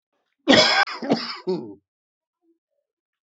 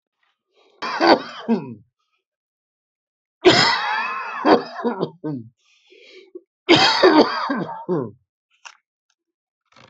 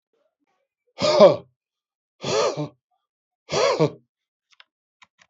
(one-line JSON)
{"cough_length": "3.2 s", "cough_amplitude": 29326, "cough_signal_mean_std_ratio": 0.37, "three_cough_length": "9.9 s", "three_cough_amplitude": 32767, "three_cough_signal_mean_std_ratio": 0.41, "exhalation_length": "5.3 s", "exhalation_amplitude": 27792, "exhalation_signal_mean_std_ratio": 0.32, "survey_phase": "beta (2021-08-13 to 2022-03-07)", "age": "45-64", "gender": "Male", "wearing_mask": "No", "symptom_cough_any": true, "symptom_runny_or_blocked_nose": true, "symptom_shortness_of_breath": true, "symptom_sore_throat": true, "symptom_abdominal_pain": true, "symptom_fatigue": true, "symptom_headache": true, "symptom_onset": "4 days", "smoker_status": "Never smoked", "respiratory_condition_asthma": false, "respiratory_condition_other": false, "recruitment_source": "Test and Trace", "submission_delay": "2 days", "covid_test_result": "Positive", "covid_test_method": "ePCR"}